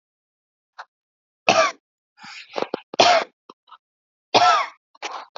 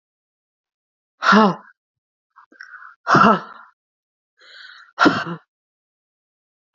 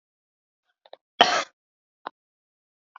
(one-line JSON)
{"three_cough_length": "5.4 s", "three_cough_amplitude": 32504, "three_cough_signal_mean_std_ratio": 0.34, "exhalation_length": "6.7 s", "exhalation_amplitude": 28098, "exhalation_signal_mean_std_ratio": 0.29, "cough_length": "3.0 s", "cough_amplitude": 32767, "cough_signal_mean_std_ratio": 0.18, "survey_phase": "alpha (2021-03-01 to 2021-08-12)", "age": "18-44", "gender": "Female", "wearing_mask": "No", "symptom_none": true, "smoker_status": "Never smoked", "respiratory_condition_asthma": true, "respiratory_condition_other": false, "recruitment_source": "REACT", "submission_delay": "2 days", "covid_test_result": "Negative", "covid_test_method": "RT-qPCR"}